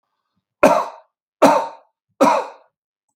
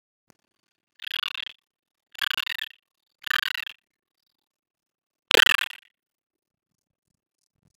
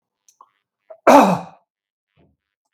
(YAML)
three_cough_length: 3.2 s
three_cough_amplitude: 32768
three_cough_signal_mean_std_ratio: 0.37
exhalation_length: 7.8 s
exhalation_amplitude: 32766
exhalation_signal_mean_std_ratio: 0.17
cough_length: 2.7 s
cough_amplitude: 32768
cough_signal_mean_std_ratio: 0.27
survey_phase: beta (2021-08-13 to 2022-03-07)
age: 65+
gender: Male
wearing_mask: 'No'
symptom_none: true
smoker_status: Ex-smoker
respiratory_condition_asthma: false
respiratory_condition_other: false
recruitment_source: REACT
submission_delay: 2 days
covid_test_result: Negative
covid_test_method: RT-qPCR